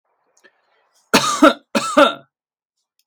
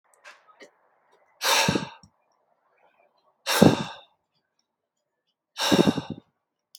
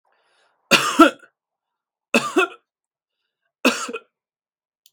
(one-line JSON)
{"cough_length": "3.1 s", "cough_amplitude": 32768, "cough_signal_mean_std_ratio": 0.34, "exhalation_length": "6.8 s", "exhalation_amplitude": 32448, "exhalation_signal_mean_std_ratio": 0.3, "three_cough_length": "4.9 s", "three_cough_amplitude": 32768, "three_cough_signal_mean_std_ratio": 0.28, "survey_phase": "beta (2021-08-13 to 2022-03-07)", "age": "18-44", "gender": "Male", "wearing_mask": "No", "symptom_none": true, "smoker_status": "Ex-smoker", "respiratory_condition_asthma": false, "respiratory_condition_other": false, "recruitment_source": "REACT", "submission_delay": "4 days", "covid_test_result": "Negative", "covid_test_method": "RT-qPCR"}